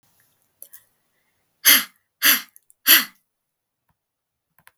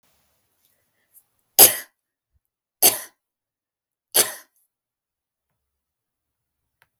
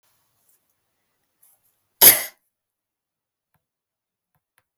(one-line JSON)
{"exhalation_length": "4.8 s", "exhalation_amplitude": 32768, "exhalation_signal_mean_std_ratio": 0.25, "three_cough_length": "7.0 s", "three_cough_amplitude": 32768, "three_cough_signal_mean_std_ratio": 0.17, "cough_length": "4.8 s", "cough_amplitude": 32766, "cough_signal_mean_std_ratio": 0.14, "survey_phase": "beta (2021-08-13 to 2022-03-07)", "age": "18-44", "gender": "Female", "wearing_mask": "No", "symptom_none": true, "smoker_status": "Never smoked", "respiratory_condition_asthma": false, "respiratory_condition_other": false, "recruitment_source": "REACT", "submission_delay": "0 days", "covid_test_result": "Negative", "covid_test_method": "RT-qPCR", "influenza_a_test_result": "Negative", "influenza_b_test_result": "Negative"}